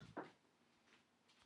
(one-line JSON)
{"cough_length": "1.5 s", "cough_amplitude": 471, "cough_signal_mean_std_ratio": 0.4, "survey_phase": "alpha (2021-03-01 to 2021-08-12)", "age": "45-64", "gender": "Female", "wearing_mask": "No", "symptom_cough_any": true, "symptom_shortness_of_breath": true, "symptom_fatigue": true, "symptom_headache": true, "symptom_change_to_sense_of_smell_or_taste": true, "symptom_loss_of_taste": true, "smoker_status": "Current smoker (1 to 10 cigarettes per day)", "respiratory_condition_asthma": false, "respiratory_condition_other": false, "recruitment_source": "Test and Trace", "submission_delay": "2 days", "covid_test_result": "Positive", "covid_test_method": "RT-qPCR"}